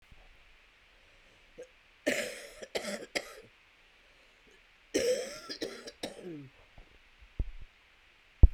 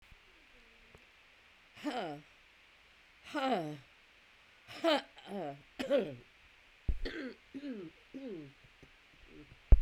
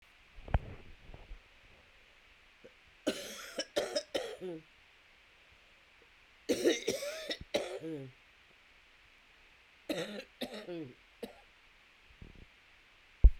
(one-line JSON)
{"cough_length": "8.5 s", "cough_amplitude": 15840, "cough_signal_mean_std_ratio": 0.24, "exhalation_length": "9.8 s", "exhalation_amplitude": 10906, "exhalation_signal_mean_std_ratio": 0.31, "three_cough_length": "13.4 s", "three_cough_amplitude": 12172, "three_cough_signal_mean_std_ratio": 0.29, "survey_phase": "alpha (2021-03-01 to 2021-08-12)", "age": "65+", "gender": "Male", "wearing_mask": "No", "symptom_cough_any": true, "symptom_shortness_of_breath": true, "symptom_fatigue": true, "symptom_headache": true, "smoker_status": "Never smoked", "respiratory_condition_asthma": false, "respiratory_condition_other": false, "recruitment_source": "Test and Trace", "submission_delay": "2 days", "covid_test_result": "Positive", "covid_test_method": "RT-qPCR", "covid_ct_value": 17.9, "covid_ct_gene": "ORF1ab gene", "covid_ct_mean": 19.1, "covid_viral_load": "560000 copies/ml", "covid_viral_load_category": "Low viral load (10K-1M copies/ml)"}